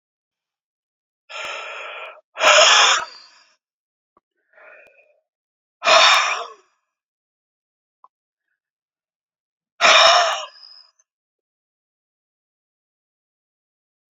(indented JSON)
{
  "exhalation_length": "14.2 s",
  "exhalation_amplitude": 31862,
  "exhalation_signal_mean_std_ratio": 0.3,
  "survey_phase": "beta (2021-08-13 to 2022-03-07)",
  "age": "65+",
  "gender": "Male",
  "wearing_mask": "No",
  "symptom_cough_any": true,
  "symptom_shortness_of_breath": true,
  "symptom_sore_throat": true,
  "symptom_onset": "13 days",
  "smoker_status": "Ex-smoker",
  "respiratory_condition_asthma": true,
  "respiratory_condition_other": false,
  "recruitment_source": "REACT",
  "submission_delay": "1 day",
  "covid_test_result": "Negative",
  "covid_test_method": "RT-qPCR"
}